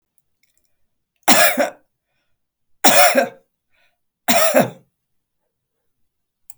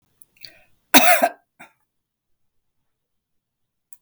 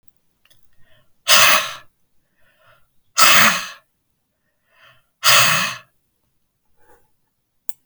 {"three_cough_length": "6.6 s", "three_cough_amplitude": 32768, "three_cough_signal_mean_std_ratio": 0.33, "cough_length": "4.0 s", "cough_amplitude": 32768, "cough_signal_mean_std_ratio": 0.22, "exhalation_length": "7.9 s", "exhalation_amplitude": 32768, "exhalation_signal_mean_std_ratio": 0.33, "survey_phase": "beta (2021-08-13 to 2022-03-07)", "age": "65+", "gender": "Female", "wearing_mask": "No", "symptom_none": true, "smoker_status": "Never smoked", "respiratory_condition_asthma": false, "respiratory_condition_other": false, "recruitment_source": "REACT", "submission_delay": "2 days", "covid_test_result": "Negative", "covid_test_method": "RT-qPCR"}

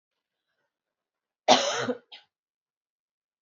{"cough_length": "3.4 s", "cough_amplitude": 20248, "cough_signal_mean_std_ratio": 0.24, "survey_phase": "beta (2021-08-13 to 2022-03-07)", "age": "18-44", "gender": "Female", "wearing_mask": "No", "symptom_cough_any": true, "symptom_runny_or_blocked_nose": true, "symptom_shortness_of_breath": true, "symptom_fatigue": true, "symptom_headache": true, "symptom_other": true, "smoker_status": "Never smoked", "respiratory_condition_asthma": false, "respiratory_condition_other": false, "recruitment_source": "Test and Trace", "submission_delay": "3 days", "covid_test_result": "Positive", "covid_test_method": "RT-qPCR", "covid_ct_value": 22.7, "covid_ct_gene": "N gene", "covid_ct_mean": 22.9, "covid_viral_load": "32000 copies/ml", "covid_viral_load_category": "Low viral load (10K-1M copies/ml)"}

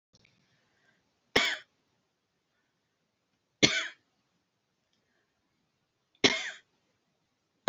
{"three_cough_length": "7.7 s", "three_cough_amplitude": 21478, "three_cough_signal_mean_std_ratio": 0.2, "survey_phase": "alpha (2021-03-01 to 2021-08-12)", "age": "65+", "gender": "Female", "wearing_mask": "No", "symptom_none": true, "smoker_status": "Never smoked", "respiratory_condition_asthma": false, "respiratory_condition_other": false, "recruitment_source": "REACT", "submission_delay": "1 day", "covid_test_result": "Negative", "covid_test_method": "RT-qPCR"}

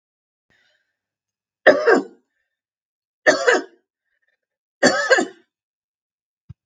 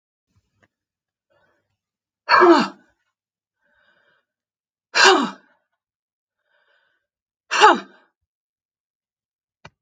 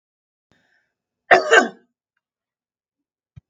{"three_cough_length": "6.7 s", "three_cough_amplitude": 32767, "three_cough_signal_mean_std_ratio": 0.3, "exhalation_length": "9.8 s", "exhalation_amplitude": 32766, "exhalation_signal_mean_std_ratio": 0.24, "cough_length": "3.5 s", "cough_amplitude": 32766, "cough_signal_mean_std_ratio": 0.22, "survey_phase": "beta (2021-08-13 to 2022-03-07)", "age": "65+", "gender": "Female", "wearing_mask": "No", "symptom_none": true, "symptom_onset": "5 days", "smoker_status": "Never smoked", "respiratory_condition_asthma": false, "respiratory_condition_other": false, "recruitment_source": "REACT", "submission_delay": "1 day", "covid_test_result": "Negative", "covid_test_method": "RT-qPCR", "influenza_a_test_result": "Negative", "influenza_b_test_result": "Negative"}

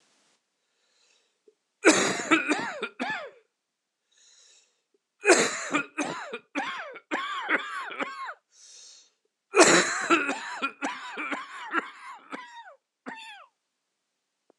{"three_cough_length": "14.6 s", "three_cough_amplitude": 23982, "three_cough_signal_mean_std_ratio": 0.4, "survey_phase": "beta (2021-08-13 to 2022-03-07)", "age": "45-64", "gender": "Male", "wearing_mask": "No", "symptom_cough_any": true, "symptom_runny_or_blocked_nose": true, "symptom_shortness_of_breath": true, "symptom_sore_throat": true, "symptom_fatigue": true, "symptom_change_to_sense_of_smell_or_taste": true, "symptom_onset": "3 days", "smoker_status": "Ex-smoker", "respiratory_condition_asthma": false, "respiratory_condition_other": false, "recruitment_source": "Test and Trace", "submission_delay": "2 days", "covid_test_result": "Positive", "covid_test_method": "RT-qPCR", "covid_ct_value": 22.1, "covid_ct_gene": "ORF1ab gene"}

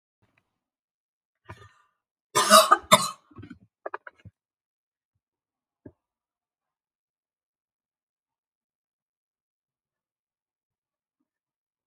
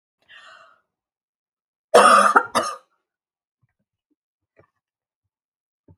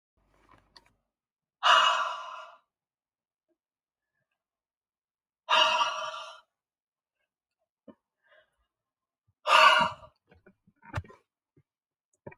{"cough_length": "11.9 s", "cough_amplitude": 30084, "cough_signal_mean_std_ratio": 0.15, "three_cough_length": "6.0 s", "three_cough_amplitude": 28988, "three_cough_signal_mean_std_ratio": 0.25, "exhalation_length": "12.4 s", "exhalation_amplitude": 16104, "exhalation_signal_mean_std_ratio": 0.28, "survey_phase": "alpha (2021-03-01 to 2021-08-12)", "age": "18-44", "gender": "Female", "wearing_mask": "No", "symptom_none": true, "smoker_status": "Never smoked", "respiratory_condition_asthma": false, "respiratory_condition_other": false, "recruitment_source": "REACT", "submission_delay": "1 day", "covid_test_result": "Negative", "covid_test_method": "RT-qPCR"}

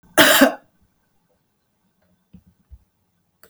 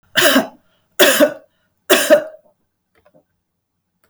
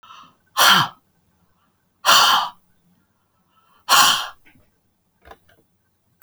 {"cough_length": "3.5 s", "cough_amplitude": 32768, "cough_signal_mean_std_ratio": 0.25, "three_cough_length": "4.1 s", "three_cough_amplitude": 32768, "three_cough_signal_mean_std_ratio": 0.38, "exhalation_length": "6.2 s", "exhalation_amplitude": 32767, "exhalation_signal_mean_std_ratio": 0.34, "survey_phase": "beta (2021-08-13 to 2022-03-07)", "age": "65+", "gender": "Female", "wearing_mask": "No", "symptom_none": true, "smoker_status": "Never smoked", "respiratory_condition_asthma": false, "respiratory_condition_other": false, "recruitment_source": "REACT", "submission_delay": "2 days", "covid_test_result": "Negative", "covid_test_method": "RT-qPCR"}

